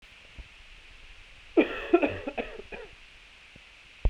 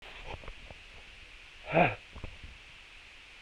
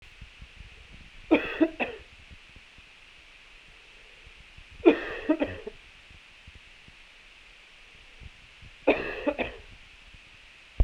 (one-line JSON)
{"cough_length": "4.1 s", "cough_amplitude": 13726, "cough_signal_mean_std_ratio": 0.35, "exhalation_length": "3.4 s", "exhalation_amplitude": 8792, "exhalation_signal_mean_std_ratio": 0.38, "three_cough_length": "10.8 s", "three_cough_amplitude": 18624, "three_cough_signal_mean_std_ratio": 0.32, "survey_phase": "beta (2021-08-13 to 2022-03-07)", "age": "18-44", "gender": "Male", "wearing_mask": "No", "symptom_cough_any": true, "symptom_runny_or_blocked_nose": true, "symptom_fatigue": true, "smoker_status": "Never smoked", "respiratory_condition_asthma": false, "respiratory_condition_other": false, "recruitment_source": "Test and Trace", "submission_delay": "2 days", "covid_test_result": "Positive", "covid_test_method": "RT-qPCR", "covid_ct_value": 24.5, "covid_ct_gene": "ORF1ab gene"}